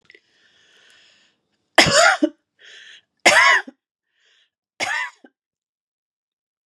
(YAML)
three_cough_length: 6.7 s
three_cough_amplitude: 32768
three_cough_signal_mean_std_ratio: 0.31
survey_phase: beta (2021-08-13 to 2022-03-07)
age: 45-64
gender: Female
wearing_mask: 'No'
symptom_none: true
smoker_status: Never smoked
respiratory_condition_asthma: false
respiratory_condition_other: false
recruitment_source: REACT
submission_delay: 32 days
covid_test_result: Negative
covid_test_method: RT-qPCR
influenza_a_test_result: Negative
influenza_b_test_result: Negative